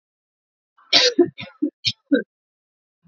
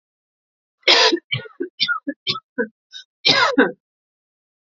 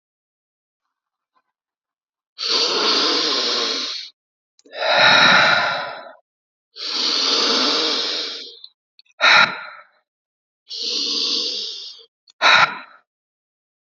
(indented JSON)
{
  "three_cough_length": "3.1 s",
  "three_cough_amplitude": 30801,
  "three_cough_signal_mean_std_ratio": 0.32,
  "cough_length": "4.7 s",
  "cough_amplitude": 29772,
  "cough_signal_mean_std_ratio": 0.4,
  "exhalation_length": "13.9 s",
  "exhalation_amplitude": 29770,
  "exhalation_signal_mean_std_ratio": 0.53,
  "survey_phase": "alpha (2021-03-01 to 2021-08-12)",
  "age": "18-44",
  "gender": "Female",
  "wearing_mask": "No",
  "symptom_fatigue": true,
  "symptom_headache": true,
  "symptom_onset": "3 days",
  "smoker_status": "Never smoked",
  "respiratory_condition_asthma": false,
  "respiratory_condition_other": false,
  "recruitment_source": "Test and Trace",
  "submission_delay": "2 days",
  "covid_test_result": "Positive",
  "covid_test_method": "RT-qPCR",
  "covid_ct_value": 17.1,
  "covid_ct_gene": "N gene",
  "covid_ct_mean": 17.4,
  "covid_viral_load": "2000000 copies/ml",
  "covid_viral_load_category": "High viral load (>1M copies/ml)"
}